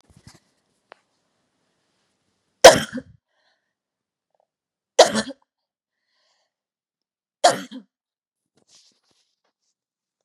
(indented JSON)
{
  "three_cough_length": "10.2 s",
  "three_cough_amplitude": 32768,
  "three_cough_signal_mean_std_ratio": 0.15,
  "survey_phase": "beta (2021-08-13 to 2022-03-07)",
  "age": "18-44",
  "gender": "Female",
  "wearing_mask": "No",
  "symptom_none": true,
  "smoker_status": "Never smoked",
  "respiratory_condition_asthma": true,
  "respiratory_condition_other": false,
  "recruitment_source": "REACT",
  "submission_delay": "5 days",
  "covid_test_result": "Negative",
  "covid_test_method": "RT-qPCR",
  "influenza_a_test_result": "Negative",
  "influenza_b_test_result": "Negative"
}